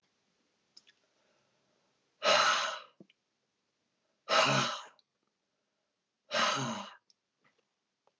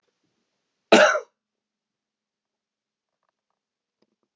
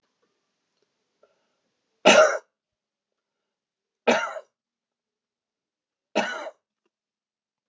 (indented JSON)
{
  "exhalation_length": "8.2 s",
  "exhalation_amplitude": 6722,
  "exhalation_signal_mean_std_ratio": 0.34,
  "cough_length": "4.4 s",
  "cough_amplitude": 28717,
  "cough_signal_mean_std_ratio": 0.19,
  "three_cough_length": "7.7 s",
  "three_cough_amplitude": 30428,
  "three_cough_signal_mean_std_ratio": 0.22,
  "survey_phase": "beta (2021-08-13 to 2022-03-07)",
  "age": "45-64",
  "gender": "Male",
  "wearing_mask": "No",
  "symptom_none": true,
  "smoker_status": "Ex-smoker",
  "respiratory_condition_asthma": false,
  "respiratory_condition_other": false,
  "recruitment_source": "REACT",
  "submission_delay": "3 days",
  "covid_test_result": "Negative",
  "covid_test_method": "RT-qPCR",
  "influenza_a_test_result": "Negative",
  "influenza_b_test_result": "Negative"
}